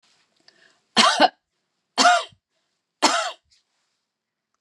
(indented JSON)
{
  "three_cough_length": "4.6 s",
  "three_cough_amplitude": 27838,
  "three_cough_signal_mean_std_ratio": 0.32,
  "survey_phase": "beta (2021-08-13 to 2022-03-07)",
  "age": "65+",
  "gender": "Female",
  "wearing_mask": "No",
  "symptom_runny_or_blocked_nose": true,
  "smoker_status": "Never smoked",
  "respiratory_condition_asthma": false,
  "respiratory_condition_other": false,
  "recruitment_source": "REACT",
  "submission_delay": "1 day",
  "covid_test_result": "Negative",
  "covid_test_method": "RT-qPCR"
}